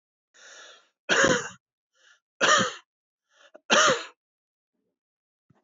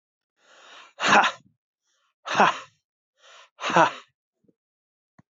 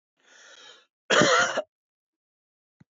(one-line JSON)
{"three_cough_length": "5.6 s", "three_cough_amplitude": 17068, "three_cough_signal_mean_std_ratio": 0.34, "exhalation_length": "5.3 s", "exhalation_amplitude": 22263, "exhalation_signal_mean_std_ratio": 0.29, "cough_length": "2.9 s", "cough_amplitude": 18818, "cough_signal_mean_std_ratio": 0.34, "survey_phase": "beta (2021-08-13 to 2022-03-07)", "age": "65+", "gender": "Male", "wearing_mask": "No", "symptom_none": true, "smoker_status": "Ex-smoker", "respiratory_condition_asthma": false, "respiratory_condition_other": false, "recruitment_source": "REACT", "submission_delay": "1 day", "covid_test_result": "Negative", "covid_test_method": "RT-qPCR", "influenza_a_test_result": "Negative", "influenza_b_test_result": "Negative"}